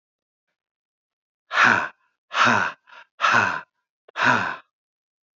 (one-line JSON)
{"exhalation_length": "5.4 s", "exhalation_amplitude": 21871, "exhalation_signal_mean_std_ratio": 0.41, "survey_phase": "beta (2021-08-13 to 2022-03-07)", "age": "45-64", "gender": "Male", "wearing_mask": "No", "symptom_none": true, "symptom_onset": "3 days", "smoker_status": "Current smoker (e-cigarettes or vapes only)", "respiratory_condition_asthma": false, "respiratory_condition_other": false, "recruitment_source": "Test and Trace", "submission_delay": "2 days", "covid_test_result": "Positive", "covid_test_method": "RT-qPCR", "covid_ct_value": 22.1, "covid_ct_gene": "ORF1ab gene", "covid_ct_mean": 22.3, "covid_viral_load": "47000 copies/ml", "covid_viral_load_category": "Low viral load (10K-1M copies/ml)"}